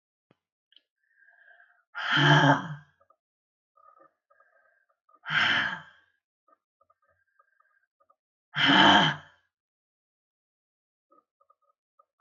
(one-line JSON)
{"exhalation_length": "12.2 s", "exhalation_amplitude": 17087, "exhalation_signal_mean_std_ratio": 0.29, "survey_phase": "beta (2021-08-13 to 2022-03-07)", "age": "65+", "gender": "Female", "wearing_mask": "No", "symptom_none": true, "smoker_status": "Never smoked", "respiratory_condition_asthma": false, "respiratory_condition_other": false, "recruitment_source": "REACT", "submission_delay": "3 days", "covid_test_result": "Negative", "covid_test_method": "RT-qPCR", "influenza_a_test_result": "Negative", "influenza_b_test_result": "Negative"}